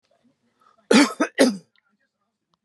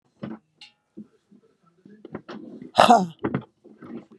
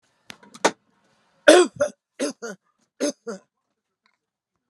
{"cough_length": "2.6 s", "cough_amplitude": 26018, "cough_signal_mean_std_ratio": 0.31, "exhalation_length": "4.2 s", "exhalation_amplitude": 32768, "exhalation_signal_mean_std_ratio": 0.27, "three_cough_length": "4.7 s", "three_cough_amplitude": 32768, "three_cough_signal_mean_std_ratio": 0.25, "survey_phase": "beta (2021-08-13 to 2022-03-07)", "age": "65+", "gender": "Female", "wearing_mask": "No", "symptom_none": true, "smoker_status": "Ex-smoker", "respiratory_condition_asthma": false, "respiratory_condition_other": false, "recruitment_source": "REACT", "submission_delay": "2 days", "covid_test_result": "Negative", "covid_test_method": "RT-qPCR", "influenza_a_test_result": "Negative", "influenza_b_test_result": "Negative"}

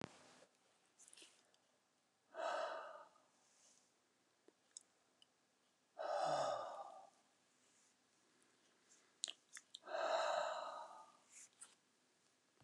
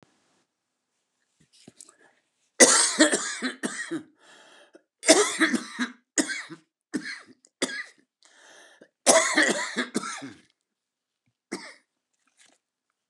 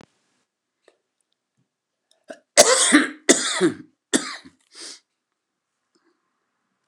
{"exhalation_length": "12.6 s", "exhalation_amplitude": 3116, "exhalation_signal_mean_std_ratio": 0.4, "three_cough_length": "13.1 s", "three_cough_amplitude": 29138, "three_cough_signal_mean_std_ratio": 0.34, "cough_length": "6.9 s", "cough_amplitude": 29204, "cough_signal_mean_std_ratio": 0.28, "survey_phase": "beta (2021-08-13 to 2022-03-07)", "age": "65+", "gender": "Male", "wearing_mask": "No", "symptom_cough_any": true, "smoker_status": "Current smoker (11 or more cigarettes per day)", "respiratory_condition_asthma": false, "respiratory_condition_other": true, "recruitment_source": "REACT", "submission_delay": "9 days", "covid_test_result": "Negative", "covid_test_method": "RT-qPCR", "influenza_a_test_result": "Negative", "influenza_b_test_result": "Negative"}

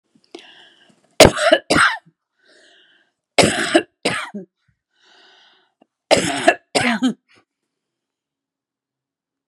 {"three_cough_length": "9.5 s", "three_cough_amplitude": 32768, "three_cough_signal_mean_std_ratio": 0.32, "survey_phase": "beta (2021-08-13 to 2022-03-07)", "age": "65+", "gender": "Female", "wearing_mask": "No", "symptom_none": true, "smoker_status": "Never smoked", "respiratory_condition_asthma": false, "respiratory_condition_other": false, "recruitment_source": "REACT", "submission_delay": "1 day", "covid_test_result": "Negative", "covid_test_method": "RT-qPCR"}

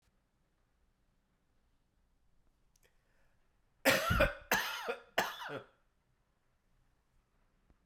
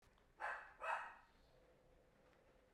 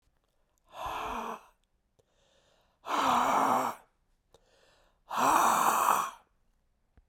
{"cough_length": "7.9 s", "cough_amplitude": 6865, "cough_signal_mean_std_ratio": 0.29, "three_cough_length": "2.7 s", "three_cough_amplitude": 977, "three_cough_signal_mean_std_ratio": 0.44, "exhalation_length": "7.1 s", "exhalation_amplitude": 9965, "exhalation_signal_mean_std_ratio": 0.48, "survey_phase": "beta (2021-08-13 to 2022-03-07)", "age": "45-64", "gender": "Male", "wearing_mask": "No", "symptom_cough_any": true, "symptom_new_continuous_cough": true, "symptom_runny_or_blocked_nose": true, "smoker_status": "Never smoked", "respiratory_condition_asthma": false, "respiratory_condition_other": false, "recruitment_source": "Test and Trace", "submission_delay": "2 days", "covid_test_result": "Positive", "covid_test_method": "RT-qPCR", "covid_ct_value": 24.6, "covid_ct_gene": "E gene"}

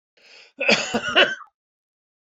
{"cough_length": "2.4 s", "cough_amplitude": 24614, "cough_signal_mean_std_ratio": 0.38, "survey_phase": "beta (2021-08-13 to 2022-03-07)", "age": "45-64", "gender": "Male", "wearing_mask": "No", "symptom_cough_any": true, "symptom_sore_throat": true, "symptom_fatigue": true, "symptom_headache": true, "smoker_status": "Ex-smoker", "respiratory_condition_asthma": false, "respiratory_condition_other": false, "recruitment_source": "Test and Trace", "submission_delay": "2 days", "covid_test_result": "Positive", "covid_test_method": "RT-qPCR"}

